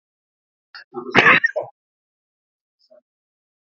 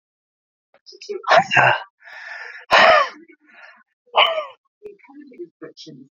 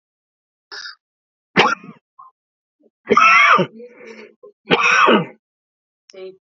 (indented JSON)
{
  "cough_length": "3.8 s",
  "cough_amplitude": 30197,
  "cough_signal_mean_std_ratio": 0.25,
  "exhalation_length": "6.1 s",
  "exhalation_amplitude": 32767,
  "exhalation_signal_mean_std_ratio": 0.37,
  "three_cough_length": "6.5 s",
  "three_cough_amplitude": 28698,
  "three_cough_signal_mean_std_ratio": 0.39,
  "survey_phase": "beta (2021-08-13 to 2022-03-07)",
  "age": "65+",
  "gender": "Male",
  "wearing_mask": "No",
  "symptom_none": true,
  "smoker_status": "Ex-smoker",
  "respiratory_condition_asthma": false,
  "respiratory_condition_other": false,
  "recruitment_source": "REACT",
  "submission_delay": "1 day",
  "covid_test_result": "Negative",
  "covid_test_method": "RT-qPCR",
  "covid_ct_value": 40.0,
  "covid_ct_gene": "N gene",
  "influenza_a_test_result": "Negative",
  "influenza_b_test_result": "Negative"
}